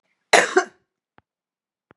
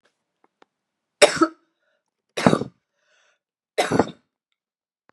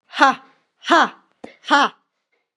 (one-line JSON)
{"cough_length": "2.0 s", "cough_amplitude": 32569, "cough_signal_mean_std_ratio": 0.25, "three_cough_length": "5.1 s", "three_cough_amplitude": 32767, "three_cough_signal_mean_std_ratio": 0.24, "exhalation_length": "2.6 s", "exhalation_amplitude": 32767, "exhalation_signal_mean_std_ratio": 0.36, "survey_phase": "beta (2021-08-13 to 2022-03-07)", "age": "45-64", "gender": "Female", "wearing_mask": "No", "symptom_runny_or_blocked_nose": true, "symptom_sore_throat": true, "symptom_fatigue": true, "symptom_change_to_sense_of_smell_or_taste": true, "symptom_onset": "3 days", "smoker_status": "Ex-smoker", "respiratory_condition_asthma": false, "respiratory_condition_other": false, "recruitment_source": "Test and Trace", "submission_delay": "2 days", "covid_test_result": "Positive", "covid_test_method": "RT-qPCR", "covid_ct_value": 19.4, "covid_ct_gene": "ORF1ab gene"}